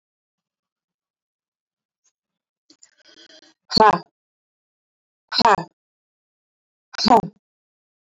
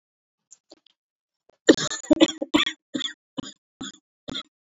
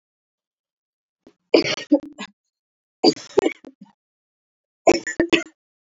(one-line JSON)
{"exhalation_length": "8.1 s", "exhalation_amplitude": 27544, "exhalation_signal_mean_std_ratio": 0.21, "cough_length": "4.8 s", "cough_amplitude": 27593, "cough_signal_mean_std_ratio": 0.25, "three_cough_length": "5.9 s", "three_cough_amplitude": 27983, "three_cough_signal_mean_std_ratio": 0.27, "survey_phase": "beta (2021-08-13 to 2022-03-07)", "age": "18-44", "gender": "Female", "wearing_mask": "No", "symptom_cough_any": true, "symptom_runny_or_blocked_nose": true, "symptom_shortness_of_breath": true, "symptom_diarrhoea": true, "symptom_fatigue": true, "symptom_fever_high_temperature": true, "symptom_headache": true, "symptom_change_to_sense_of_smell_or_taste": true, "smoker_status": "Never smoked", "respiratory_condition_asthma": false, "respiratory_condition_other": false, "recruitment_source": "Test and Trace", "submission_delay": "2 days", "covid_test_result": "Positive", "covid_test_method": "RT-qPCR", "covid_ct_value": 22.8, "covid_ct_gene": "ORF1ab gene", "covid_ct_mean": 23.9, "covid_viral_load": "15000 copies/ml", "covid_viral_load_category": "Low viral load (10K-1M copies/ml)"}